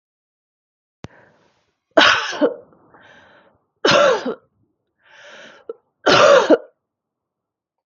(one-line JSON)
{"three_cough_length": "7.9 s", "three_cough_amplitude": 32768, "three_cough_signal_mean_std_ratio": 0.34, "survey_phase": "beta (2021-08-13 to 2022-03-07)", "age": "45-64", "gender": "Female", "wearing_mask": "No", "symptom_cough_any": true, "symptom_new_continuous_cough": true, "symptom_fatigue": true, "symptom_change_to_sense_of_smell_or_taste": true, "symptom_other": true, "symptom_onset": "9 days", "smoker_status": "Ex-smoker", "respiratory_condition_asthma": false, "respiratory_condition_other": false, "recruitment_source": "REACT", "submission_delay": "1 day", "covid_test_result": "Positive", "covid_test_method": "RT-qPCR", "covid_ct_value": 30.0, "covid_ct_gene": "E gene", "influenza_a_test_result": "Negative", "influenza_b_test_result": "Negative"}